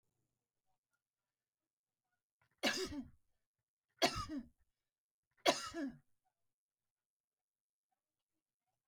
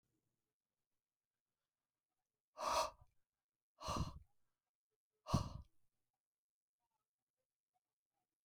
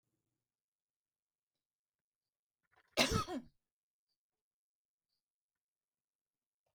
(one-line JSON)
{"three_cough_length": "8.9 s", "three_cough_amplitude": 4586, "three_cough_signal_mean_std_ratio": 0.24, "exhalation_length": "8.4 s", "exhalation_amplitude": 2527, "exhalation_signal_mean_std_ratio": 0.24, "cough_length": "6.7 s", "cough_amplitude": 4125, "cough_signal_mean_std_ratio": 0.17, "survey_phase": "beta (2021-08-13 to 2022-03-07)", "age": "65+", "gender": "Female", "wearing_mask": "No", "symptom_none": true, "smoker_status": "Ex-smoker", "respiratory_condition_asthma": false, "respiratory_condition_other": false, "recruitment_source": "REACT", "submission_delay": "2 days", "covid_test_result": "Negative", "covid_test_method": "RT-qPCR"}